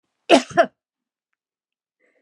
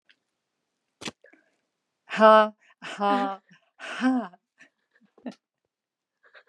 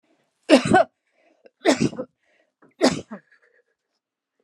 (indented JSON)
{
  "cough_length": "2.2 s",
  "cough_amplitude": 32767,
  "cough_signal_mean_std_ratio": 0.23,
  "exhalation_length": "6.5 s",
  "exhalation_amplitude": 21634,
  "exhalation_signal_mean_std_ratio": 0.28,
  "three_cough_length": "4.4 s",
  "three_cough_amplitude": 30760,
  "three_cough_signal_mean_std_ratio": 0.3,
  "survey_phase": "beta (2021-08-13 to 2022-03-07)",
  "age": "65+",
  "gender": "Female",
  "wearing_mask": "No",
  "symptom_none": true,
  "smoker_status": "Ex-smoker",
  "respiratory_condition_asthma": false,
  "respiratory_condition_other": false,
  "recruitment_source": "REACT",
  "submission_delay": "0 days",
  "covid_test_result": "Negative",
  "covid_test_method": "RT-qPCR",
  "influenza_a_test_result": "Negative",
  "influenza_b_test_result": "Negative"
}